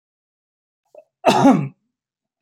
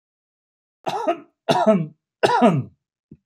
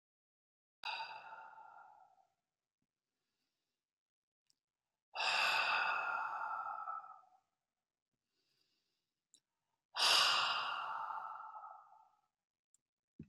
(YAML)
cough_length: 2.4 s
cough_amplitude: 27319
cough_signal_mean_std_ratio: 0.32
three_cough_length: 3.3 s
three_cough_amplitude: 26698
three_cough_signal_mean_std_ratio: 0.44
exhalation_length: 13.3 s
exhalation_amplitude: 4222
exhalation_signal_mean_std_ratio: 0.41
survey_phase: beta (2021-08-13 to 2022-03-07)
age: 65+
gender: Male
wearing_mask: 'No'
symptom_none: true
smoker_status: Ex-smoker
respiratory_condition_asthma: false
respiratory_condition_other: false
recruitment_source: REACT
submission_delay: 1 day
covid_test_result: Negative
covid_test_method: RT-qPCR